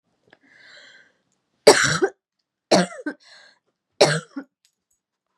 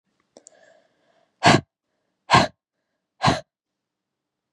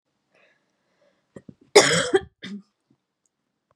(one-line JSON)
{"three_cough_length": "5.4 s", "three_cough_amplitude": 32768, "three_cough_signal_mean_std_ratio": 0.27, "exhalation_length": "4.5 s", "exhalation_amplitude": 29795, "exhalation_signal_mean_std_ratio": 0.24, "cough_length": "3.8 s", "cough_amplitude": 32706, "cough_signal_mean_std_ratio": 0.24, "survey_phase": "beta (2021-08-13 to 2022-03-07)", "age": "18-44", "gender": "Female", "wearing_mask": "No", "symptom_cough_any": true, "symptom_runny_or_blocked_nose": true, "symptom_sore_throat": true, "symptom_fatigue": true, "symptom_change_to_sense_of_smell_or_taste": true, "smoker_status": "Never smoked", "respiratory_condition_asthma": false, "respiratory_condition_other": false, "recruitment_source": "Test and Trace", "submission_delay": "1 day", "covid_test_result": "Positive", "covid_test_method": "RT-qPCR", "covid_ct_value": 23.9, "covid_ct_gene": "ORF1ab gene", "covid_ct_mean": 25.0, "covid_viral_load": "6500 copies/ml", "covid_viral_load_category": "Minimal viral load (< 10K copies/ml)"}